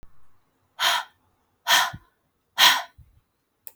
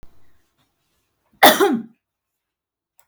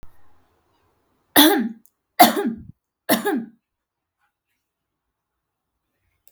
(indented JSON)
{
  "exhalation_length": "3.8 s",
  "exhalation_amplitude": 26092,
  "exhalation_signal_mean_std_ratio": 0.34,
  "cough_length": "3.1 s",
  "cough_amplitude": 32768,
  "cough_signal_mean_std_ratio": 0.26,
  "three_cough_length": "6.3 s",
  "three_cough_amplitude": 32768,
  "three_cough_signal_mean_std_ratio": 0.28,
  "survey_phase": "beta (2021-08-13 to 2022-03-07)",
  "age": "18-44",
  "gender": "Female",
  "wearing_mask": "No",
  "symptom_runny_or_blocked_nose": true,
  "symptom_sore_throat": true,
  "symptom_onset": "9 days",
  "smoker_status": "Ex-smoker",
  "respiratory_condition_asthma": false,
  "respiratory_condition_other": false,
  "recruitment_source": "REACT",
  "submission_delay": "0 days",
  "covid_test_result": "Positive",
  "covid_test_method": "RT-qPCR",
  "covid_ct_value": 20.0,
  "covid_ct_gene": "E gene",
  "influenza_a_test_result": "Negative",
  "influenza_b_test_result": "Negative"
}